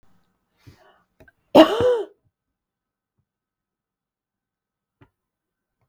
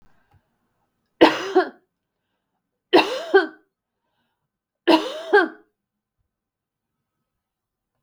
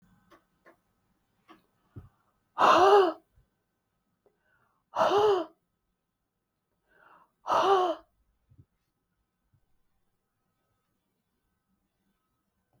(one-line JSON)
{"cough_length": "5.9 s", "cough_amplitude": 32768, "cough_signal_mean_std_ratio": 0.19, "three_cough_length": "8.0 s", "three_cough_amplitude": 32768, "three_cough_signal_mean_std_ratio": 0.27, "exhalation_length": "12.8 s", "exhalation_amplitude": 11988, "exhalation_signal_mean_std_ratio": 0.28, "survey_phase": "beta (2021-08-13 to 2022-03-07)", "age": "65+", "gender": "Female", "wearing_mask": "No", "symptom_none": true, "smoker_status": "Never smoked", "respiratory_condition_asthma": false, "respiratory_condition_other": false, "recruitment_source": "REACT", "submission_delay": "2 days", "covid_test_result": "Negative", "covid_test_method": "RT-qPCR"}